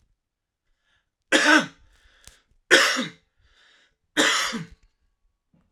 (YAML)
three_cough_length: 5.7 s
three_cough_amplitude: 32768
three_cough_signal_mean_std_ratio: 0.34
survey_phase: alpha (2021-03-01 to 2021-08-12)
age: 45-64
gender: Male
wearing_mask: 'No'
symptom_none: true
smoker_status: Never smoked
respiratory_condition_asthma: false
respiratory_condition_other: false
recruitment_source: REACT
submission_delay: 2 days
covid_test_result: Negative
covid_test_method: RT-qPCR